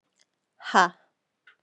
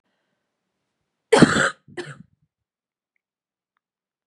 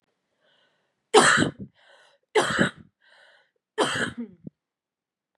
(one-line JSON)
{"exhalation_length": "1.6 s", "exhalation_amplitude": 19265, "exhalation_signal_mean_std_ratio": 0.22, "cough_length": "4.3 s", "cough_amplitude": 31762, "cough_signal_mean_std_ratio": 0.22, "three_cough_length": "5.4 s", "three_cough_amplitude": 26722, "three_cough_signal_mean_std_ratio": 0.33, "survey_phase": "beta (2021-08-13 to 2022-03-07)", "age": "18-44", "gender": "Female", "wearing_mask": "No", "symptom_cough_any": true, "symptom_fatigue": true, "symptom_other": true, "symptom_onset": "10 days", "smoker_status": "Never smoked", "respiratory_condition_asthma": false, "respiratory_condition_other": false, "recruitment_source": "REACT", "submission_delay": "1 day", "covid_test_result": "Negative", "covid_test_method": "RT-qPCR"}